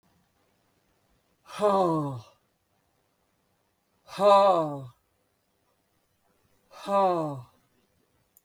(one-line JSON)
{"exhalation_length": "8.4 s", "exhalation_amplitude": 12707, "exhalation_signal_mean_std_ratio": 0.35, "survey_phase": "beta (2021-08-13 to 2022-03-07)", "age": "45-64", "gender": "Female", "wearing_mask": "No", "symptom_none": true, "smoker_status": "Never smoked", "respiratory_condition_asthma": false, "respiratory_condition_other": false, "recruitment_source": "REACT", "submission_delay": "0 days", "covid_test_result": "Negative", "covid_test_method": "RT-qPCR", "influenza_a_test_result": "Negative", "influenza_b_test_result": "Negative"}